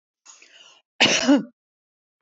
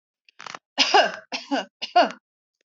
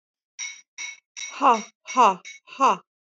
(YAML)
cough_length: 2.2 s
cough_amplitude: 19612
cough_signal_mean_std_ratio: 0.35
three_cough_length: 2.6 s
three_cough_amplitude: 21073
three_cough_signal_mean_std_ratio: 0.38
exhalation_length: 3.2 s
exhalation_amplitude: 19071
exhalation_signal_mean_std_ratio: 0.38
survey_phase: beta (2021-08-13 to 2022-03-07)
age: 18-44
gender: Female
wearing_mask: 'No'
symptom_none: true
smoker_status: Never smoked
respiratory_condition_asthma: false
respiratory_condition_other: false
recruitment_source: REACT
submission_delay: 1 day
covid_test_result: Negative
covid_test_method: RT-qPCR
influenza_a_test_result: Unknown/Void
influenza_b_test_result: Unknown/Void